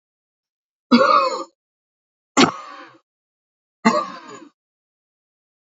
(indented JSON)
{
  "three_cough_length": "5.7 s",
  "three_cough_amplitude": 28858,
  "three_cough_signal_mean_std_ratio": 0.3,
  "survey_phase": "beta (2021-08-13 to 2022-03-07)",
  "age": "45-64",
  "gender": "Male",
  "wearing_mask": "No",
  "symptom_none": true,
  "smoker_status": "Never smoked",
  "respiratory_condition_asthma": false,
  "respiratory_condition_other": false,
  "recruitment_source": "REACT",
  "submission_delay": "3 days",
  "covid_test_result": "Negative",
  "covid_test_method": "RT-qPCR",
  "influenza_a_test_result": "Negative",
  "influenza_b_test_result": "Negative"
}